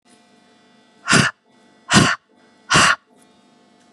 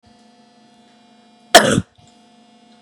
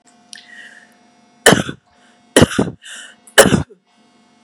{"exhalation_length": "3.9 s", "exhalation_amplitude": 32768, "exhalation_signal_mean_std_ratio": 0.35, "cough_length": "2.8 s", "cough_amplitude": 32768, "cough_signal_mean_std_ratio": 0.22, "three_cough_length": "4.4 s", "three_cough_amplitude": 32768, "three_cough_signal_mean_std_ratio": 0.3, "survey_phase": "beta (2021-08-13 to 2022-03-07)", "age": "45-64", "gender": "Female", "wearing_mask": "No", "symptom_none": true, "smoker_status": "Prefer not to say", "respiratory_condition_asthma": false, "respiratory_condition_other": false, "recruitment_source": "REACT", "submission_delay": "1 day", "covid_test_result": "Negative", "covid_test_method": "RT-qPCR", "influenza_a_test_result": "Negative", "influenza_b_test_result": "Negative"}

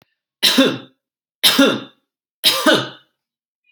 {"three_cough_length": "3.7 s", "three_cough_amplitude": 32768, "three_cough_signal_mean_std_ratio": 0.43, "survey_phase": "alpha (2021-03-01 to 2021-08-12)", "age": "18-44", "gender": "Male", "wearing_mask": "No", "symptom_none": true, "smoker_status": "Never smoked", "respiratory_condition_asthma": false, "respiratory_condition_other": false, "recruitment_source": "REACT", "submission_delay": "4 days", "covid_test_result": "Negative", "covid_test_method": "RT-qPCR"}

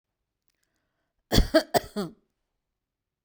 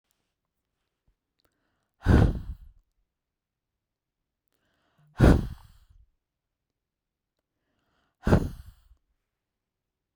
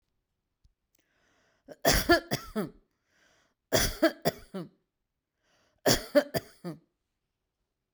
{"cough_length": "3.2 s", "cough_amplitude": 16569, "cough_signal_mean_std_ratio": 0.25, "exhalation_length": "10.2 s", "exhalation_amplitude": 18888, "exhalation_signal_mean_std_ratio": 0.22, "three_cough_length": "7.9 s", "three_cough_amplitude": 14700, "three_cough_signal_mean_std_ratio": 0.3, "survey_phase": "beta (2021-08-13 to 2022-03-07)", "age": "45-64", "gender": "Female", "wearing_mask": "No", "symptom_none": true, "smoker_status": "Never smoked", "respiratory_condition_asthma": false, "respiratory_condition_other": false, "recruitment_source": "REACT", "submission_delay": "1 day", "covid_test_result": "Negative", "covid_test_method": "RT-qPCR"}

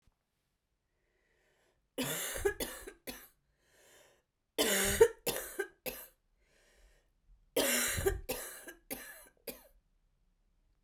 {"three_cough_length": "10.8 s", "three_cough_amplitude": 8939, "three_cough_signal_mean_std_ratio": 0.36, "survey_phase": "beta (2021-08-13 to 2022-03-07)", "age": "45-64", "gender": "Female", "wearing_mask": "No", "symptom_cough_any": true, "symptom_runny_or_blocked_nose": true, "symptom_shortness_of_breath": true, "symptom_abdominal_pain": true, "symptom_diarrhoea": true, "symptom_fatigue": true, "symptom_fever_high_temperature": true, "symptom_headache": true, "symptom_change_to_sense_of_smell_or_taste": true, "symptom_onset": "2 days", "smoker_status": "Ex-smoker", "respiratory_condition_asthma": false, "respiratory_condition_other": false, "recruitment_source": "Test and Trace", "submission_delay": "1 day", "covid_test_result": "Positive", "covid_test_method": "RT-qPCR"}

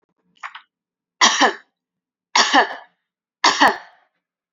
{"three_cough_length": "4.5 s", "three_cough_amplitude": 32768, "three_cough_signal_mean_std_ratio": 0.35, "survey_phase": "beta (2021-08-13 to 2022-03-07)", "age": "45-64", "gender": "Female", "wearing_mask": "No", "symptom_none": true, "smoker_status": "Never smoked", "respiratory_condition_asthma": false, "respiratory_condition_other": false, "recruitment_source": "REACT", "submission_delay": "1 day", "covid_test_result": "Negative", "covid_test_method": "RT-qPCR", "covid_ct_value": 47.0, "covid_ct_gene": "N gene"}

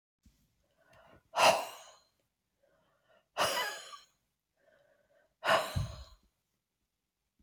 {"exhalation_length": "7.4 s", "exhalation_amplitude": 9321, "exhalation_signal_mean_std_ratio": 0.29, "survey_phase": "alpha (2021-03-01 to 2021-08-12)", "age": "65+", "gender": "Female", "wearing_mask": "No", "symptom_none": true, "smoker_status": "Ex-smoker", "respiratory_condition_asthma": false, "respiratory_condition_other": false, "recruitment_source": "REACT", "submission_delay": "2 days", "covid_test_result": "Negative", "covid_test_method": "RT-qPCR"}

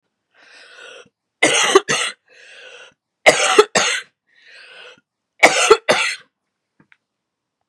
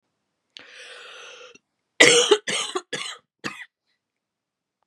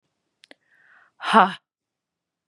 {"three_cough_length": "7.7 s", "three_cough_amplitude": 32768, "three_cough_signal_mean_std_ratio": 0.36, "cough_length": "4.9 s", "cough_amplitude": 32768, "cough_signal_mean_std_ratio": 0.29, "exhalation_length": "2.5 s", "exhalation_amplitude": 28999, "exhalation_signal_mean_std_ratio": 0.21, "survey_phase": "beta (2021-08-13 to 2022-03-07)", "age": "45-64", "gender": "Female", "wearing_mask": "No", "symptom_cough_any": true, "symptom_runny_or_blocked_nose": true, "symptom_sore_throat": true, "symptom_diarrhoea": true, "symptom_fever_high_temperature": true, "symptom_change_to_sense_of_smell_or_taste": true, "smoker_status": "Never smoked", "respiratory_condition_asthma": false, "respiratory_condition_other": false, "recruitment_source": "Test and Trace", "submission_delay": "1 day", "covid_test_result": "Positive", "covid_test_method": "LFT"}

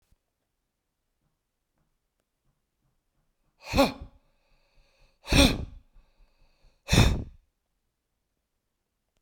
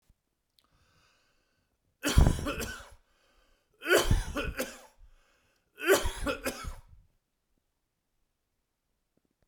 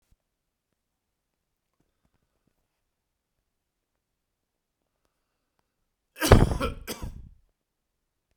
{"exhalation_length": "9.2 s", "exhalation_amplitude": 17221, "exhalation_signal_mean_std_ratio": 0.23, "three_cough_length": "9.5 s", "three_cough_amplitude": 13904, "three_cough_signal_mean_std_ratio": 0.33, "cough_length": "8.4 s", "cough_amplitude": 32767, "cough_signal_mean_std_ratio": 0.16, "survey_phase": "beta (2021-08-13 to 2022-03-07)", "age": "45-64", "gender": "Male", "wearing_mask": "No", "symptom_none": true, "symptom_onset": "12 days", "smoker_status": "Never smoked", "respiratory_condition_asthma": false, "respiratory_condition_other": false, "recruitment_source": "REACT", "submission_delay": "3 days", "covid_test_result": "Negative", "covid_test_method": "RT-qPCR", "influenza_a_test_result": "Unknown/Void", "influenza_b_test_result": "Unknown/Void"}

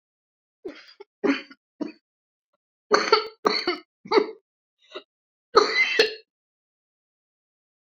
{"three_cough_length": "7.9 s", "three_cough_amplitude": 27555, "three_cough_signal_mean_std_ratio": 0.32, "survey_phase": "beta (2021-08-13 to 2022-03-07)", "age": "45-64", "gender": "Female", "wearing_mask": "No", "symptom_cough_any": true, "symptom_shortness_of_breath": true, "symptom_sore_throat": true, "symptom_onset": "12 days", "smoker_status": "Never smoked", "respiratory_condition_asthma": false, "respiratory_condition_other": true, "recruitment_source": "REACT", "submission_delay": "2 days", "covid_test_result": "Negative", "covid_test_method": "RT-qPCR"}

